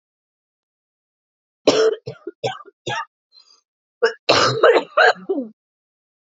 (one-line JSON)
{"three_cough_length": "6.4 s", "three_cough_amplitude": 28897, "three_cough_signal_mean_std_ratio": 0.37, "survey_phase": "alpha (2021-03-01 to 2021-08-12)", "age": "45-64", "gender": "Female", "wearing_mask": "No", "symptom_cough_any": true, "symptom_shortness_of_breath": true, "symptom_fatigue": true, "symptom_fever_high_temperature": true, "symptom_headache": true, "symptom_onset": "5 days", "smoker_status": "Current smoker (e-cigarettes or vapes only)", "respiratory_condition_asthma": false, "respiratory_condition_other": false, "recruitment_source": "Test and Trace", "submission_delay": "2 days", "covid_test_result": "Positive", "covid_test_method": "RT-qPCR", "covid_ct_value": 17.4, "covid_ct_gene": "ORF1ab gene", "covid_ct_mean": 18.1, "covid_viral_load": "1200000 copies/ml", "covid_viral_load_category": "High viral load (>1M copies/ml)"}